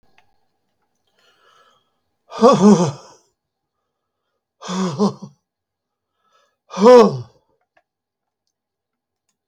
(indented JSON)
{
  "exhalation_length": "9.5 s",
  "exhalation_amplitude": 32768,
  "exhalation_signal_mean_std_ratio": 0.27,
  "survey_phase": "beta (2021-08-13 to 2022-03-07)",
  "age": "65+",
  "gender": "Male",
  "wearing_mask": "No",
  "symptom_cough_any": true,
  "symptom_runny_or_blocked_nose": true,
  "symptom_onset": "5 days",
  "smoker_status": "Never smoked",
  "respiratory_condition_asthma": false,
  "respiratory_condition_other": false,
  "recruitment_source": "REACT",
  "submission_delay": "4 days",
  "covid_test_result": "Negative",
  "covid_test_method": "RT-qPCR",
  "influenza_a_test_result": "Negative",
  "influenza_b_test_result": "Negative"
}